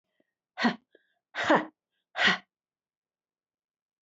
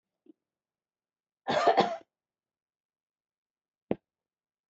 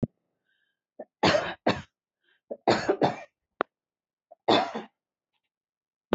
{
  "exhalation_length": "4.0 s",
  "exhalation_amplitude": 10495,
  "exhalation_signal_mean_std_ratio": 0.29,
  "cough_length": "4.7 s",
  "cough_amplitude": 12140,
  "cough_signal_mean_std_ratio": 0.23,
  "three_cough_length": "6.1 s",
  "three_cough_amplitude": 14347,
  "three_cough_signal_mean_std_ratio": 0.32,
  "survey_phase": "beta (2021-08-13 to 2022-03-07)",
  "age": "65+",
  "gender": "Female",
  "wearing_mask": "No",
  "symptom_runny_or_blocked_nose": true,
  "symptom_onset": "13 days",
  "smoker_status": "Never smoked",
  "respiratory_condition_asthma": false,
  "respiratory_condition_other": false,
  "recruitment_source": "REACT",
  "submission_delay": "1 day",
  "covid_test_result": "Negative",
  "covid_test_method": "RT-qPCR"
}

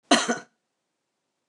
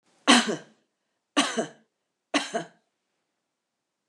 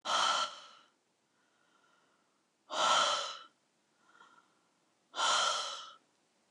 {
  "cough_length": "1.5 s",
  "cough_amplitude": 22940,
  "cough_signal_mean_std_ratio": 0.28,
  "three_cough_length": "4.1 s",
  "three_cough_amplitude": 26934,
  "three_cough_signal_mean_std_ratio": 0.29,
  "exhalation_length": "6.5 s",
  "exhalation_amplitude": 5790,
  "exhalation_signal_mean_std_ratio": 0.43,
  "survey_phase": "beta (2021-08-13 to 2022-03-07)",
  "age": "65+",
  "gender": "Female",
  "wearing_mask": "No",
  "symptom_none": true,
  "smoker_status": "Never smoked",
  "respiratory_condition_asthma": false,
  "respiratory_condition_other": false,
  "recruitment_source": "REACT",
  "submission_delay": "1 day",
  "covid_test_result": "Negative",
  "covid_test_method": "RT-qPCR"
}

